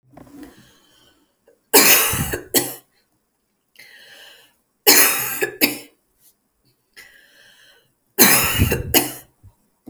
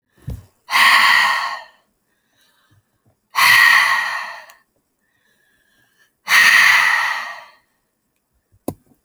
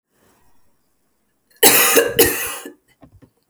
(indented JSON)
{
  "three_cough_length": "9.9 s",
  "three_cough_amplitude": 32768,
  "three_cough_signal_mean_std_ratio": 0.37,
  "exhalation_length": "9.0 s",
  "exhalation_amplitude": 31924,
  "exhalation_signal_mean_std_ratio": 0.46,
  "cough_length": "3.5 s",
  "cough_amplitude": 32768,
  "cough_signal_mean_std_ratio": 0.38,
  "survey_phase": "beta (2021-08-13 to 2022-03-07)",
  "age": "18-44",
  "gender": "Female",
  "wearing_mask": "No",
  "symptom_sore_throat": true,
  "smoker_status": "Ex-smoker",
  "respiratory_condition_asthma": false,
  "respiratory_condition_other": false,
  "recruitment_source": "REACT",
  "submission_delay": "0 days",
  "covid_test_result": "Negative",
  "covid_test_method": "RT-qPCR"
}